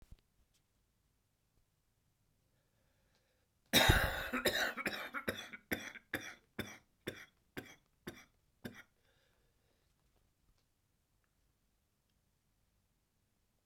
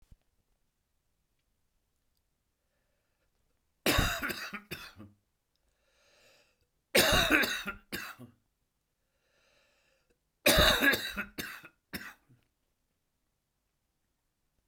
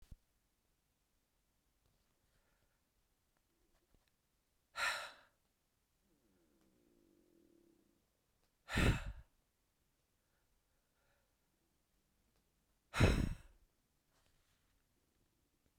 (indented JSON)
{
  "cough_length": "13.7 s",
  "cough_amplitude": 6741,
  "cough_signal_mean_std_ratio": 0.26,
  "three_cough_length": "14.7 s",
  "three_cough_amplitude": 10476,
  "three_cough_signal_mean_std_ratio": 0.3,
  "exhalation_length": "15.8 s",
  "exhalation_amplitude": 4384,
  "exhalation_signal_mean_std_ratio": 0.2,
  "survey_phase": "beta (2021-08-13 to 2022-03-07)",
  "age": "65+",
  "gender": "Male",
  "wearing_mask": "No",
  "symptom_cough_any": true,
  "symptom_runny_or_blocked_nose": true,
  "symptom_sore_throat": true,
  "symptom_fatigue": true,
  "symptom_fever_high_temperature": true,
  "symptom_headache": true,
  "smoker_status": "Ex-smoker",
  "respiratory_condition_asthma": false,
  "respiratory_condition_other": false,
  "recruitment_source": "Test and Trace",
  "submission_delay": "2 days",
  "covid_test_result": "Positive",
  "covid_test_method": "LFT"
}